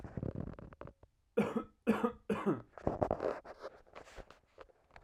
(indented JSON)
{
  "three_cough_length": "5.0 s",
  "three_cough_amplitude": 5779,
  "three_cough_signal_mean_std_ratio": 0.44,
  "survey_phase": "alpha (2021-03-01 to 2021-08-12)",
  "age": "18-44",
  "gender": "Male",
  "wearing_mask": "No",
  "symptom_cough_any": true,
  "symptom_fatigue": true,
  "smoker_status": "Ex-smoker",
  "respiratory_condition_asthma": false,
  "respiratory_condition_other": false,
  "recruitment_source": "Test and Trace",
  "submission_delay": "2 days",
  "covid_test_result": "Positive",
  "covid_test_method": "RT-qPCR",
  "covid_ct_value": 24.3,
  "covid_ct_gene": "N gene"
}